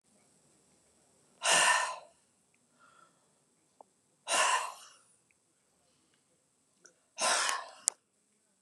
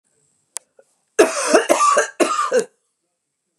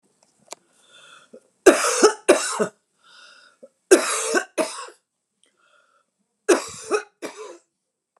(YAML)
exhalation_length: 8.6 s
exhalation_amplitude: 28418
exhalation_signal_mean_std_ratio: 0.32
cough_length: 3.6 s
cough_amplitude: 29204
cough_signal_mean_std_ratio: 0.46
three_cough_length: 8.2 s
three_cough_amplitude: 29203
three_cough_signal_mean_std_ratio: 0.32
survey_phase: beta (2021-08-13 to 2022-03-07)
age: 65+
gender: Female
wearing_mask: 'No'
symptom_cough_any: true
smoker_status: Ex-smoker
respiratory_condition_asthma: false
respiratory_condition_other: false
recruitment_source: REACT
submission_delay: 1 day
covid_test_result: Negative
covid_test_method: RT-qPCR